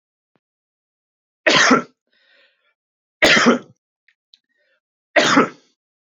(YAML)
three_cough_length: 6.1 s
three_cough_amplitude: 29296
three_cough_signal_mean_std_ratio: 0.33
survey_phase: beta (2021-08-13 to 2022-03-07)
age: 18-44
gender: Male
wearing_mask: 'No'
symptom_none: true
smoker_status: Never smoked
respiratory_condition_asthma: false
respiratory_condition_other: false
recruitment_source: REACT
submission_delay: 1 day
covid_test_result: Negative
covid_test_method: RT-qPCR
influenza_a_test_result: Negative
influenza_b_test_result: Negative